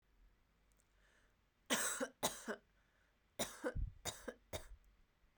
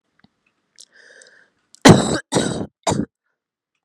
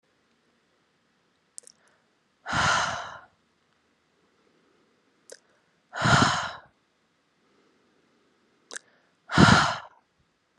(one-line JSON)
{"three_cough_length": "5.4 s", "three_cough_amplitude": 2840, "three_cough_signal_mean_std_ratio": 0.4, "cough_length": "3.8 s", "cough_amplitude": 32768, "cough_signal_mean_std_ratio": 0.29, "exhalation_length": "10.6 s", "exhalation_amplitude": 27977, "exhalation_signal_mean_std_ratio": 0.28, "survey_phase": "beta (2021-08-13 to 2022-03-07)", "age": "18-44", "gender": "Female", "wearing_mask": "No", "symptom_none": true, "smoker_status": "Never smoked", "respiratory_condition_asthma": false, "respiratory_condition_other": false, "recruitment_source": "REACT", "submission_delay": "2 days", "covid_test_result": "Negative", "covid_test_method": "RT-qPCR", "influenza_a_test_result": "Negative", "influenza_b_test_result": "Negative"}